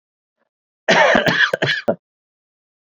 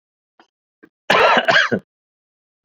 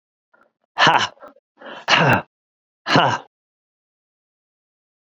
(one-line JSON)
{"three_cough_length": "2.8 s", "three_cough_amplitude": 28283, "three_cough_signal_mean_std_ratio": 0.45, "cough_length": "2.6 s", "cough_amplitude": 32767, "cough_signal_mean_std_ratio": 0.4, "exhalation_length": "5.0 s", "exhalation_amplitude": 29086, "exhalation_signal_mean_std_ratio": 0.34, "survey_phase": "beta (2021-08-13 to 2022-03-07)", "age": "65+", "gender": "Male", "wearing_mask": "Yes", "symptom_cough_any": true, "symptom_runny_or_blocked_nose": true, "symptom_fever_high_temperature": true, "symptom_headache": true, "smoker_status": "Ex-smoker", "respiratory_condition_asthma": false, "respiratory_condition_other": false, "recruitment_source": "Test and Trace", "submission_delay": "1 day", "covid_test_result": "Positive", "covid_test_method": "RT-qPCR", "covid_ct_value": 21.0, "covid_ct_gene": "ORF1ab gene"}